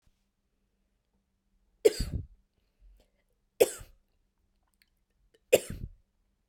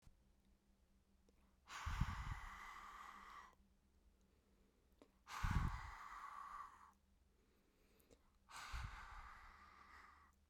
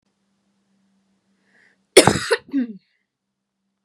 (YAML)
three_cough_length: 6.5 s
three_cough_amplitude: 14477
three_cough_signal_mean_std_ratio: 0.18
exhalation_length: 10.5 s
exhalation_amplitude: 1624
exhalation_signal_mean_std_ratio: 0.45
cough_length: 3.8 s
cough_amplitude: 32768
cough_signal_mean_std_ratio: 0.22
survey_phase: beta (2021-08-13 to 2022-03-07)
age: 18-44
gender: Female
wearing_mask: 'No'
symptom_none: true
smoker_status: Never smoked
respiratory_condition_asthma: false
respiratory_condition_other: false
recruitment_source: REACT
submission_delay: 1 day
covid_test_result: Negative
covid_test_method: RT-qPCR